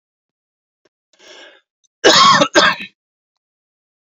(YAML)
cough_length: 4.0 s
cough_amplitude: 29953
cough_signal_mean_std_ratio: 0.34
survey_phase: beta (2021-08-13 to 2022-03-07)
age: 45-64
gender: Male
wearing_mask: 'No'
symptom_none: true
symptom_onset: 6 days
smoker_status: Ex-smoker
respiratory_condition_asthma: false
respiratory_condition_other: false
recruitment_source: REACT
submission_delay: 1 day
covid_test_result: Negative
covid_test_method: RT-qPCR